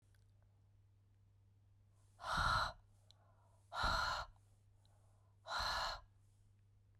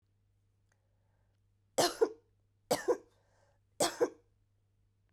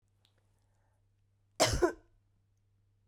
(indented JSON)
{
  "exhalation_length": "7.0 s",
  "exhalation_amplitude": 1900,
  "exhalation_signal_mean_std_ratio": 0.43,
  "three_cough_length": "5.1 s",
  "three_cough_amplitude": 5260,
  "three_cough_signal_mean_std_ratio": 0.27,
  "cough_length": "3.1 s",
  "cough_amplitude": 8829,
  "cough_signal_mean_std_ratio": 0.25,
  "survey_phase": "beta (2021-08-13 to 2022-03-07)",
  "age": "18-44",
  "gender": "Female",
  "wearing_mask": "No",
  "symptom_cough_any": true,
  "symptom_runny_or_blocked_nose": true,
  "symptom_sore_throat": true,
  "symptom_fatigue": true,
  "symptom_headache": true,
  "symptom_onset": "3 days",
  "smoker_status": "Ex-smoker",
  "respiratory_condition_asthma": true,
  "respiratory_condition_other": false,
  "recruitment_source": "Test and Trace",
  "submission_delay": "1 day",
  "covid_test_result": "Positive",
  "covid_test_method": "RT-qPCR",
  "covid_ct_value": 22.0,
  "covid_ct_gene": "ORF1ab gene",
  "covid_ct_mean": 22.3,
  "covid_viral_load": "48000 copies/ml",
  "covid_viral_load_category": "Low viral load (10K-1M copies/ml)"
}